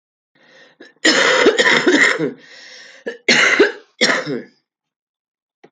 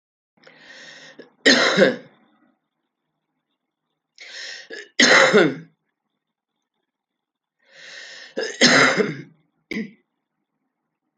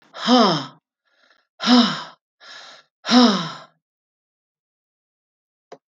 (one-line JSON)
{"cough_length": "5.7 s", "cough_amplitude": 32768, "cough_signal_mean_std_ratio": 0.51, "three_cough_length": "11.2 s", "three_cough_amplitude": 30239, "three_cough_signal_mean_std_ratio": 0.33, "exhalation_length": "5.9 s", "exhalation_amplitude": 26352, "exhalation_signal_mean_std_ratio": 0.35, "survey_phase": "alpha (2021-03-01 to 2021-08-12)", "age": "65+", "gender": "Female", "wearing_mask": "No", "symptom_cough_any": true, "symptom_diarrhoea": true, "symptom_change_to_sense_of_smell_or_taste": true, "symptom_loss_of_taste": true, "symptom_onset": "6 days", "smoker_status": "Ex-smoker", "respiratory_condition_asthma": false, "respiratory_condition_other": false, "recruitment_source": "Test and Trace", "submission_delay": "1 day", "covid_test_result": "Positive", "covid_test_method": "RT-qPCR", "covid_ct_value": 17.4, "covid_ct_gene": "ORF1ab gene", "covid_ct_mean": 18.0, "covid_viral_load": "1300000 copies/ml", "covid_viral_load_category": "High viral load (>1M copies/ml)"}